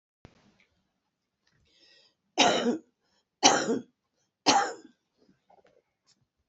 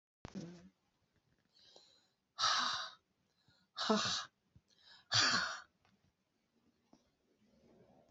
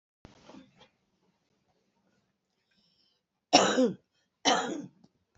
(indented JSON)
{
  "three_cough_length": "6.5 s",
  "three_cough_amplitude": 20847,
  "three_cough_signal_mean_std_ratio": 0.3,
  "exhalation_length": "8.1 s",
  "exhalation_amplitude": 4011,
  "exhalation_signal_mean_std_ratio": 0.35,
  "cough_length": "5.4 s",
  "cough_amplitude": 19313,
  "cough_signal_mean_std_ratio": 0.27,
  "survey_phase": "beta (2021-08-13 to 2022-03-07)",
  "age": "65+",
  "gender": "Female",
  "wearing_mask": "No",
  "symptom_cough_any": true,
  "symptom_new_continuous_cough": true,
  "symptom_onset": "4 days",
  "smoker_status": "Never smoked",
  "respiratory_condition_asthma": false,
  "respiratory_condition_other": false,
  "recruitment_source": "Test and Trace",
  "submission_delay": "0 days",
  "covid_test_result": "Positive",
  "covid_test_method": "RT-qPCR"
}